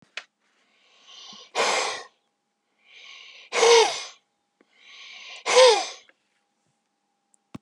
{"exhalation_length": "7.6 s", "exhalation_amplitude": 26383, "exhalation_signal_mean_std_ratio": 0.32, "survey_phase": "beta (2021-08-13 to 2022-03-07)", "age": "65+", "gender": "Male", "wearing_mask": "No", "symptom_none": true, "smoker_status": "Never smoked", "respiratory_condition_asthma": false, "respiratory_condition_other": false, "recruitment_source": "REACT", "submission_delay": "3 days", "covid_test_result": "Negative", "covid_test_method": "RT-qPCR", "influenza_a_test_result": "Negative", "influenza_b_test_result": "Negative"}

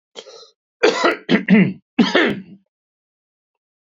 {"cough_length": "3.8 s", "cough_amplitude": 27044, "cough_signal_mean_std_ratio": 0.42, "survey_phase": "beta (2021-08-13 to 2022-03-07)", "age": "65+", "gender": "Male", "wearing_mask": "No", "symptom_none": true, "smoker_status": "Ex-smoker", "respiratory_condition_asthma": false, "respiratory_condition_other": false, "recruitment_source": "REACT", "submission_delay": "-1 day", "covid_test_result": "Negative", "covid_test_method": "RT-qPCR", "influenza_a_test_result": "Negative", "influenza_b_test_result": "Negative"}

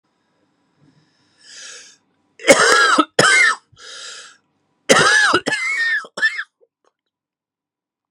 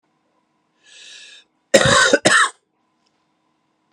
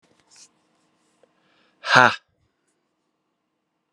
{"three_cough_length": "8.1 s", "three_cough_amplitude": 32768, "three_cough_signal_mean_std_ratio": 0.43, "cough_length": "3.9 s", "cough_amplitude": 32767, "cough_signal_mean_std_ratio": 0.34, "exhalation_length": "3.9 s", "exhalation_amplitude": 32767, "exhalation_signal_mean_std_ratio": 0.18, "survey_phase": "beta (2021-08-13 to 2022-03-07)", "age": "18-44", "gender": "Male", "wearing_mask": "No", "symptom_cough_any": true, "symptom_runny_or_blocked_nose": true, "symptom_fatigue": true, "symptom_fever_high_temperature": true, "symptom_headache": true, "symptom_onset": "3 days", "smoker_status": "Never smoked", "respiratory_condition_asthma": true, "respiratory_condition_other": false, "recruitment_source": "Test and Trace", "submission_delay": "2 days", "covid_test_result": "Positive", "covid_test_method": "RT-qPCR", "covid_ct_value": 12.7, "covid_ct_gene": "ORF1ab gene", "covid_ct_mean": 13.4, "covid_viral_load": "41000000 copies/ml", "covid_viral_load_category": "High viral load (>1M copies/ml)"}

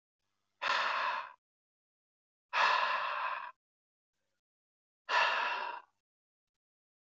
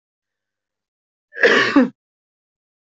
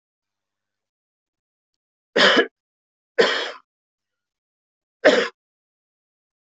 {"exhalation_length": "7.2 s", "exhalation_amplitude": 4920, "exhalation_signal_mean_std_ratio": 0.45, "cough_length": "2.9 s", "cough_amplitude": 25062, "cough_signal_mean_std_ratio": 0.32, "three_cough_length": "6.6 s", "three_cough_amplitude": 24337, "three_cough_signal_mean_std_ratio": 0.26, "survey_phase": "alpha (2021-03-01 to 2021-08-12)", "age": "18-44", "gender": "Male", "wearing_mask": "No", "symptom_abdominal_pain": true, "symptom_fatigue": true, "symptom_fever_high_temperature": true, "symptom_headache": true, "symptom_change_to_sense_of_smell_or_taste": true, "symptom_onset": "3 days", "smoker_status": "Never smoked", "respiratory_condition_asthma": false, "respiratory_condition_other": false, "recruitment_source": "Test and Trace", "submission_delay": "2 days", "covid_test_result": "Positive", "covid_test_method": "RT-qPCR", "covid_ct_value": 24.3, "covid_ct_gene": "ORF1ab gene", "covid_ct_mean": 25.0, "covid_viral_load": "6400 copies/ml", "covid_viral_load_category": "Minimal viral load (< 10K copies/ml)"}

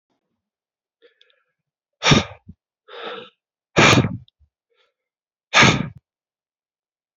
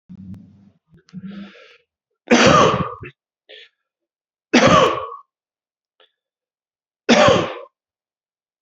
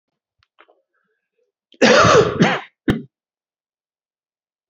{"exhalation_length": "7.2 s", "exhalation_amplitude": 28835, "exhalation_signal_mean_std_ratio": 0.28, "three_cough_length": "8.6 s", "three_cough_amplitude": 30488, "three_cough_signal_mean_std_ratio": 0.35, "cough_length": "4.7 s", "cough_amplitude": 32767, "cough_signal_mean_std_ratio": 0.34, "survey_phase": "beta (2021-08-13 to 2022-03-07)", "age": "45-64", "gender": "Male", "wearing_mask": "No", "symptom_cough_any": true, "symptom_runny_or_blocked_nose": true, "symptom_fatigue": true, "symptom_fever_high_temperature": true, "symptom_headache": true, "smoker_status": "Never smoked", "respiratory_condition_asthma": false, "respiratory_condition_other": false, "recruitment_source": "Test and Trace", "submission_delay": "2 days", "covid_test_result": "Positive", "covid_test_method": "LFT"}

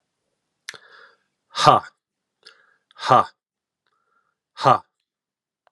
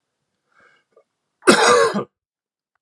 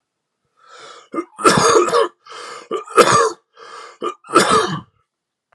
{"exhalation_length": "5.7 s", "exhalation_amplitude": 32767, "exhalation_signal_mean_std_ratio": 0.23, "cough_length": "2.8 s", "cough_amplitude": 32768, "cough_signal_mean_std_ratio": 0.34, "three_cough_length": "5.5 s", "three_cough_amplitude": 32768, "three_cough_signal_mean_std_ratio": 0.46, "survey_phase": "beta (2021-08-13 to 2022-03-07)", "age": "45-64", "gender": "Male", "wearing_mask": "No", "symptom_cough_any": true, "symptom_new_continuous_cough": true, "symptom_runny_or_blocked_nose": true, "symptom_shortness_of_breath": true, "symptom_fever_high_temperature": true, "symptom_headache": true, "symptom_change_to_sense_of_smell_or_taste": true, "symptom_onset": "5 days", "smoker_status": "Never smoked", "respiratory_condition_asthma": false, "respiratory_condition_other": false, "recruitment_source": "Test and Trace", "submission_delay": "3 days", "covid_test_result": "Positive", "covid_test_method": "RT-qPCR"}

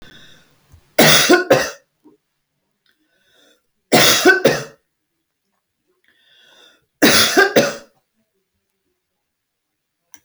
{"three_cough_length": "10.2 s", "three_cough_amplitude": 32768, "three_cough_signal_mean_std_ratio": 0.35, "survey_phase": "alpha (2021-03-01 to 2021-08-12)", "age": "65+", "gender": "Female", "wearing_mask": "No", "symptom_none": true, "smoker_status": "Never smoked", "respiratory_condition_asthma": false, "respiratory_condition_other": false, "recruitment_source": "REACT", "submission_delay": "1 day", "covid_test_result": "Negative", "covid_test_method": "RT-qPCR"}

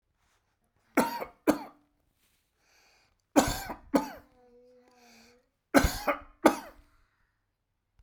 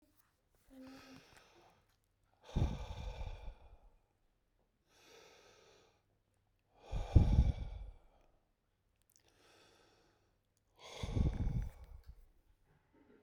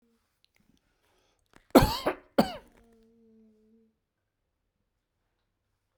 {"three_cough_length": "8.0 s", "three_cough_amplitude": 18554, "three_cough_signal_mean_std_ratio": 0.27, "exhalation_length": "13.2 s", "exhalation_amplitude": 7812, "exhalation_signal_mean_std_ratio": 0.29, "cough_length": "6.0 s", "cough_amplitude": 22486, "cough_signal_mean_std_ratio": 0.18, "survey_phase": "beta (2021-08-13 to 2022-03-07)", "age": "45-64", "gender": "Male", "wearing_mask": "No", "symptom_none": true, "smoker_status": "Ex-smoker", "respiratory_condition_asthma": false, "respiratory_condition_other": false, "recruitment_source": "REACT", "submission_delay": "1 day", "covid_test_result": "Negative", "covid_test_method": "RT-qPCR"}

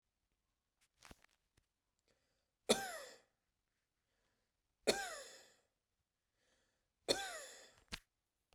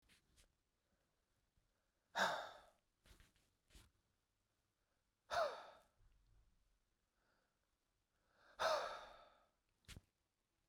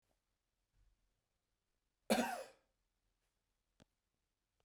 {"three_cough_length": "8.5 s", "three_cough_amplitude": 5399, "three_cough_signal_mean_std_ratio": 0.23, "exhalation_length": "10.7 s", "exhalation_amplitude": 1540, "exhalation_signal_mean_std_ratio": 0.27, "cough_length": "4.6 s", "cough_amplitude": 3042, "cough_signal_mean_std_ratio": 0.2, "survey_phase": "beta (2021-08-13 to 2022-03-07)", "age": "45-64", "gender": "Male", "wearing_mask": "No", "symptom_none": true, "smoker_status": "Never smoked", "respiratory_condition_asthma": false, "respiratory_condition_other": false, "recruitment_source": "REACT", "submission_delay": "2 days", "covid_test_result": "Negative", "covid_test_method": "RT-qPCR"}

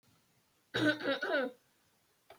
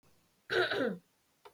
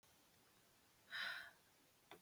{"three_cough_length": "2.4 s", "three_cough_amplitude": 4334, "three_cough_signal_mean_std_ratio": 0.45, "cough_length": "1.5 s", "cough_amplitude": 3806, "cough_signal_mean_std_ratio": 0.47, "exhalation_length": "2.2 s", "exhalation_amplitude": 732, "exhalation_signal_mean_std_ratio": 0.44, "survey_phase": "beta (2021-08-13 to 2022-03-07)", "age": "18-44", "gender": "Female", "wearing_mask": "No", "symptom_none": true, "smoker_status": "Never smoked", "respiratory_condition_asthma": false, "respiratory_condition_other": false, "recruitment_source": "REACT", "submission_delay": "0 days", "covid_test_result": "Negative", "covid_test_method": "RT-qPCR", "influenza_a_test_result": "Negative", "influenza_b_test_result": "Negative"}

